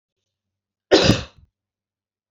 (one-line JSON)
{"cough_length": "2.3 s", "cough_amplitude": 28239, "cough_signal_mean_std_ratio": 0.26, "survey_phase": "beta (2021-08-13 to 2022-03-07)", "age": "45-64", "gender": "Female", "wearing_mask": "No", "symptom_none": true, "smoker_status": "Ex-smoker", "respiratory_condition_asthma": false, "respiratory_condition_other": false, "recruitment_source": "REACT", "submission_delay": "2 days", "covid_test_result": "Negative", "covid_test_method": "RT-qPCR"}